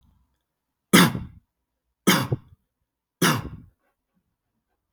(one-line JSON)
{"three_cough_length": "4.9 s", "three_cough_amplitude": 32565, "three_cough_signal_mean_std_ratio": 0.28, "survey_phase": "beta (2021-08-13 to 2022-03-07)", "age": "18-44", "gender": "Male", "wearing_mask": "No", "symptom_none": true, "smoker_status": "Never smoked", "respiratory_condition_asthma": false, "respiratory_condition_other": false, "recruitment_source": "REACT", "submission_delay": "2 days", "covid_test_result": "Negative", "covid_test_method": "RT-qPCR"}